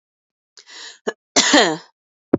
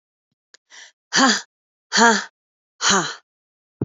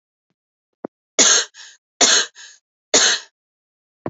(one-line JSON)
{"cough_length": "2.4 s", "cough_amplitude": 28452, "cough_signal_mean_std_ratio": 0.34, "exhalation_length": "3.8 s", "exhalation_amplitude": 28302, "exhalation_signal_mean_std_ratio": 0.37, "three_cough_length": "4.1 s", "three_cough_amplitude": 30751, "three_cough_signal_mean_std_ratio": 0.35, "survey_phase": "beta (2021-08-13 to 2022-03-07)", "age": "18-44", "gender": "Female", "wearing_mask": "No", "symptom_cough_any": true, "symptom_sore_throat": true, "symptom_fatigue": true, "symptom_fever_high_temperature": true, "symptom_headache": true, "symptom_onset": "4 days", "smoker_status": "Never smoked", "respiratory_condition_asthma": false, "respiratory_condition_other": false, "recruitment_source": "Test and Trace", "submission_delay": "1 day", "covid_test_result": "Positive", "covid_test_method": "RT-qPCR", "covid_ct_value": 15.2, "covid_ct_gene": "ORF1ab gene", "covid_ct_mean": 15.3, "covid_viral_load": "9300000 copies/ml", "covid_viral_load_category": "High viral load (>1M copies/ml)"}